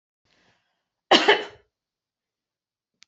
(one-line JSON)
{"cough_length": "3.1 s", "cough_amplitude": 30693, "cough_signal_mean_std_ratio": 0.22, "survey_phase": "beta (2021-08-13 to 2022-03-07)", "age": "45-64", "gender": "Female", "wearing_mask": "No", "symptom_none": true, "smoker_status": "Never smoked", "respiratory_condition_asthma": true, "respiratory_condition_other": false, "recruitment_source": "Test and Trace", "submission_delay": "3 days", "covid_test_result": "Negative", "covid_test_method": "RT-qPCR"}